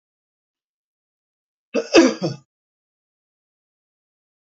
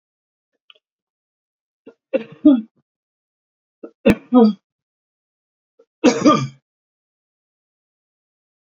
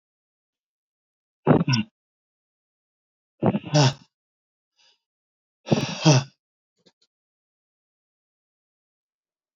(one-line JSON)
{"cough_length": "4.4 s", "cough_amplitude": 28427, "cough_signal_mean_std_ratio": 0.21, "three_cough_length": "8.6 s", "three_cough_amplitude": 29096, "three_cough_signal_mean_std_ratio": 0.25, "exhalation_length": "9.6 s", "exhalation_amplitude": 23804, "exhalation_signal_mean_std_ratio": 0.25, "survey_phase": "beta (2021-08-13 to 2022-03-07)", "age": "65+", "gender": "Male", "wearing_mask": "No", "symptom_shortness_of_breath": true, "symptom_fatigue": true, "symptom_onset": "6 days", "smoker_status": "Ex-smoker", "respiratory_condition_asthma": false, "respiratory_condition_other": false, "recruitment_source": "REACT", "submission_delay": "2 days", "covid_test_result": "Negative", "covid_test_method": "RT-qPCR"}